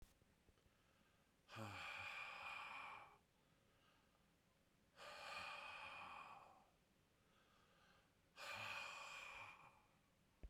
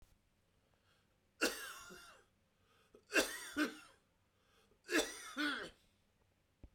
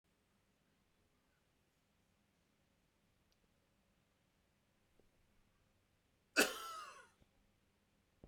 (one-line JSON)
{"exhalation_length": "10.5 s", "exhalation_amplitude": 375, "exhalation_signal_mean_std_ratio": 0.65, "three_cough_length": "6.7 s", "three_cough_amplitude": 4250, "three_cough_signal_mean_std_ratio": 0.35, "cough_length": "8.3 s", "cough_amplitude": 4523, "cough_signal_mean_std_ratio": 0.16, "survey_phase": "beta (2021-08-13 to 2022-03-07)", "age": "18-44", "gender": "Male", "wearing_mask": "No", "symptom_cough_any": true, "symptom_runny_or_blocked_nose": true, "symptom_sore_throat": true, "symptom_fatigue": true, "symptom_headache": true, "symptom_change_to_sense_of_smell_or_taste": true, "symptom_onset": "4 days", "smoker_status": "Never smoked", "respiratory_condition_asthma": false, "respiratory_condition_other": false, "recruitment_source": "Test and Trace", "submission_delay": "3 days", "covid_test_result": "Positive", "covid_test_method": "RT-qPCR", "covid_ct_value": 16.9, "covid_ct_gene": "ORF1ab gene"}